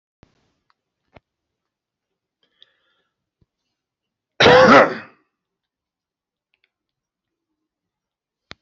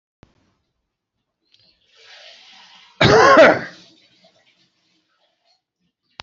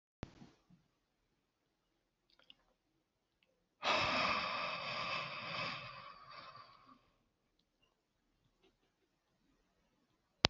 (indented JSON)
{
  "cough_length": "8.6 s",
  "cough_amplitude": 32522,
  "cough_signal_mean_std_ratio": 0.2,
  "three_cough_length": "6.2 s",
  "three_cough_amplitude": 32768,
  "three_cough_signal_mean_std_ratio": 0.26,
  "exhalation_length": "10.5 s",
  "exhalation_amplitude": 26615,
  "exhalation_signal_mean_std_ratio": 0.34,
  "survey_phase": "beta (2021-08-13 to 2022-03-07)",
  "age": "65+",
  "gender": "Male",
  "wearing_mask": "No",
  "symptom_fatigue": true,
  "symptom_change_to_sense_of_smell_or_taste": true,
  "symptom_onset": "6 days",
  "smoker_status": "Never smoked",
  "respiratory_condition_asthma": false,
  "respiratory_condition_other": false,
  "recruitment_source": "Test and Trace",
  "submission_delay": "2 days",
  "covid_test_result": "Positive",
  "covid_test_method": "RT-qPCR",
  "covid_ct_value": 16.2,
  "covid_ct_gene": "ORF1ab gene",
  "covid_ct_mean": 17.2,
  "covid_viral_load": "2200000 copies/ml",
  "covid_viral_load_category": "High viral load (>1M copies/ml)"
}